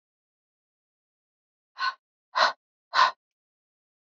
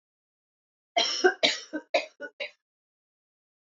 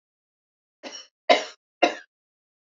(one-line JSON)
{"exhalation_length": "4.0 s", "exhalation_amplitude": 14054, "exhalation_signal_mean_std_ratio": 0.25, "cough_length": "3.7 s", "cough_amplitude": 16496, "cough_signal_mean_std_ratio": 0.32, "three_cough_length": "2.7 s", "three_cough_amplitude": 27321, "three_cough_signal_mean_std_ratio": 0.22, "survey_phase": "alpha (2021-03-01 to 2021-08-12)", "age": "45-64", "gender": "Female", "wearing_mask": "No", "symptom_cough_any": true, "symptom_fatigue": true, "symptom_fever_high_temperature": true, "symptom_headache": true, "symptom_change_to_sense_of_smell_or_taste": true, "smoker_status": "Never smoked", "respiratory_condition_asthma": false, "respiratory_condition_other": false, "recruitment_source": "Test and Trace", "submission_delay": "1 day", "covid_test_result": "Positive", "covid_test_method": "RT-qPCR", "covid_ct_value": 16.6, "covid_ct_gene": "ORF1ab gene", "covid_ct_mean": 17.2, "covid_viral_load": "2200000 copies/ml", "covid_viral_load_category": "High viral load (>1M copies/ml)"}